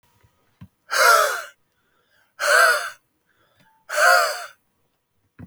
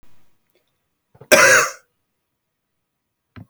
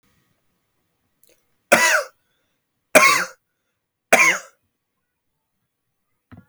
{
  "exhalation_length": "5.5 s",
  "exhalation_amplitude": 24828,
  "exhalation_signal_mean_std_ratio": 0.41,
  "cough_length": "3.5 s",
  "cough_amplitude": 32767,
  "cough_signal_mean_std_ratio": 0.27,
  "three_cough_length": "6.5 s",
  "three_cough_amplitude": 32699,
  "three_cough_signal_mean_std_ratio": 0.28,
  "survey_phase": "beta (2021-08-13 to 2022-03-07)",
  "age": "18-44",
  "gender": "Male",
  "wearing_mask": "No",
  "symptom_fatigue": true,
  "symptom_headache": true,
  "smoker_status": "Never smoked",
  "respiratory_condition_asthma": false,
  "respiratory_condition_other": false,
  "recruitment_source": "Test and Trace",
  "submission_delay": "2 days",
  "covid_test_result": "Positive",
  "covid_test_method": "RT-qPCR",
  "covid_ct_value": 18.5,
  "covid_ct_gene": "N gene",
  "covid_ct_mean": 19.1,
  "covid_viral_load": "520000 copies/ml",
  "covid_viral_load_category": "Low viral load (10K-1M copies/ml)"
}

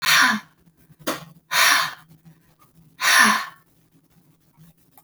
{
  "exhalation_length": "5.0 s",
  "exhalation_amplitude": 29069,
  "exhalation_signal_mean_std_ratio": 0.42,
  "survey_phase": "beta (2021-08-13 to 2022-03-07)",
  "age": "18-44",
  "gender": "Female",
  "wearing_mask": "No",
  "symptom_none": true,
  "smoker_status": "Never smoked",
  "respiratory_condition_asthma": false,
  "respiratory_condition_other": false,
  "recruitment_source": "Test and Trace",
  "submission_delay": "1 day",
  "covid_test_result": "Negative",
  "covid_test_method": "RT-qPCR"
}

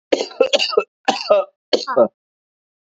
{
  "cough_length": "2.8 s",
  "cough_amplitude": 29560,
  "cough_signal_mean_std_ratio": 0.45,
  "survey_phase": "beta (2021-08-13 to 2022-03-07)",
  "age": "18-44",
  "gender": "Male",
  "wearing_mask": "No",
  "symptom_cough_any": true,
  "symptom_new_continuous_cough": true,
  "symptom_runny_or_blocked_nose": true,
  "symptom_shortness_of_breath": true,
  "symptom_sore_throat": true,
  "symptom_other": true,
  "smoker_status": "Never smoked",
  "respiratory_condition_asthma": true,
  "respiratory_condition_other": false,
  "recruitment_source": "Test and Trace",
  "submission_delay": "2 days",
  "covid_test_result": "Positive",
  "covid_test_method": "LFT"
}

